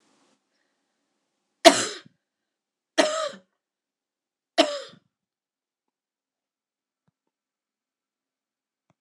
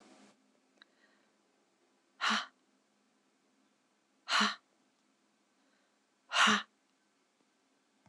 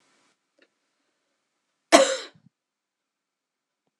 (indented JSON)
{
  "three_cough_length": "9.0 s",
  "three_cough_amplitude": 26028,
  "three_cough_signal_mean_std_ratio": 0.17,
  "exhalation_length": "8.1 s",
  "exhalation_amplitude": 6393,
  "exhalation_signal_mean_std_ratio": 0.25,
  "cough_length": "4.0 s",
  "cough_amplitude": 26028,
  "cough_signal_mean_std_ratio": 0.17,
  "survey_phase": "beta (2021-08-13 to 2022-03-07)",
  "age": "18-44",
  "gender": "Female",
  "wearing_mask": "No",
  "symptom_runny_or_blocked_nose": true,
  "symptom_sore_throat": true,
  "symptom_onset": "2 days",
  "smoker_status": "Ex-smoker",
  "respiratory_condition_asthma": false,
  "respiratory_condition_other": false,
  "recruitment_source": "Test and Trace",
  "submission_delay": "1 day",
  "covid_test_result": "Positive",
  "covid_test_method": "ePCR"
}